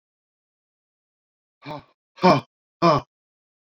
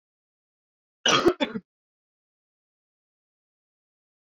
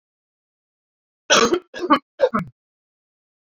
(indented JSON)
{
  "exhalation_length": "3.8 s",
  "exhalation_amplitude": 23941,
  "exhalation_signal_mean_std_ratio": 0.25,
  "cough_length": "4.3 s",
  "cough_amplitude": 14345,
  "cough_signal_mean_std_ratio": 0.22,
  "three_cough_length": "3.4 s",
  "three_cough_amplitude": 29250,
  "three_cough_signal_mean_std_ratio": 0.32,
  "survey_phase": "beta (2021-08-13 to 2022-03-07)",
  "age": "45-64",
  "gender": "Male",
  "wearing_mask": "No",
  "symptom_cough_any": true,
  "symptom_runny_or_blocked_nose": true,
  "smoker_status": "Never smoked",
  "respiratory_condition_asthma": false,
  "respiratory_condition_other": false,
  "recruitment_source": "Test and Trace",
  "submission_delay": "1 day",
  "covid_test_result": "Positive",
  "covid_test_method": "RT-qPCR",
  "covid_ct_value": 23.9,
  "covid_ct_gene": "ORF1ab gene",
  "covid_ct_mean": 24.3,
  "covid_viral_load": "11000 copies/ml",
  "covid_viral_load_category": "Low viral load (10K-1M copies/ml)"
}